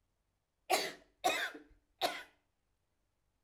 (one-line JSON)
{"three_cough_length": "3.4 s", "three_cough_amplitude": 5201, "three_cough_signal_mean_std_ratio": 0.34, "survey_phase": "alpha (2021-03-01 to 2021-08-12)", "age": "65+", "gender": "Female", "wearing_mask": "No", "symptom_none": true, "smoker_status": "Never smoked", "respiratory_condition_asthma": true, "respiratory_condition_other": false, "recruitment_source": "REACT", "submission_delay": "2 days", "covid_test_result": "Negative", "covid_test_method": "RT-qPCR"}